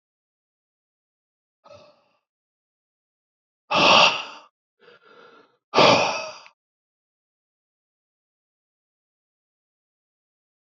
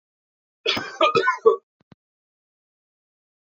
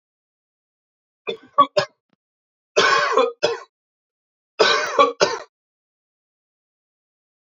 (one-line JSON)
{"exhalation_length": "10.7 s", "exhalation_amplitude": 27168, "exhalation_signal_mean_std_ratio": 0.23, "cough_length": "3.4 s", "cough_amplitude": 24721, "cough_signal_mean_std_ratio": 0.32, "three_cough_length": "7.4 s", "three_cough_amplitude": 28530, "three_cough_signal_mean_std_ratio": 0.34, "survey_phase": "beta (2021-08-13 to 2022-03-07)", "age": "45-64", "gender": "Male", "wearing_mask": "No", "symptom_cough_any": true, "symptom_sore_throat": true, "symptom_fatigue": true, "symptom_other": true, "smoker_status": "Never smoked", "respiratory_condition_asthma": false, "respiratory_condition_other": false, "recruitment_source": "Test and Trace", "submission_delay": "1 day", "covid_test_result": "Positive", "covid_test_method": "RT-qPCR", "covid_ct_value": 23.6, "covid_ct_gene": "N gene"}